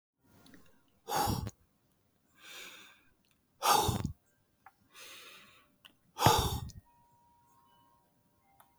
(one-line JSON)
{"exhalation_length": "8.8 s", "exhalation_amplitude": 15013, "exhalation_signal_mean_std_ratio": 0.32, "survey_phase": "beta (2021-08-13 to 2022-03-07)", "age": "45-64", "gender": "Female", "wearing_mask": "No", "symptom_none": true, "smoker_status": "Never smoked", "respiratory_condition_asthma": false, "respiratory_condition_other": false, "recruitment_source": "REACT", "submission_delay": "3 days", "covid_test_result": "Negative", "covid_test_method": "RT-qPCR", "influenza_a_test_result": "Negative", "influenza_b_test_result": "Negative"}